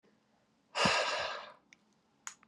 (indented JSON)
{
  "exhalation_length": "2.5 s",
  "exhalation_amplitude": 6105,
  "exhalation_signal_mean_std_ratio": 0.42,
  "survey_phase": "beta (2021-08-13 to 2022-03-07)",
  "age": "18-44",
  "gender": "Male",
  "wearing_mask": "No",
  "symptom_diarrhoea": true,
  "symptom_onset": "4 days",
  "smoker_status": "Ex-smoker",
  "respiratory_condition_asthma": false,
  "respiratory_condition_other": false,
  "recruitment_source": "Test and Trace",
  "submission_delay": "2 days",
  "covid_test_result": "Positive",
  "covid_test_method": "RT-qPCR",
  "covid_ct_value": 25.4,
  "covid_ct_gene": "N gene"
}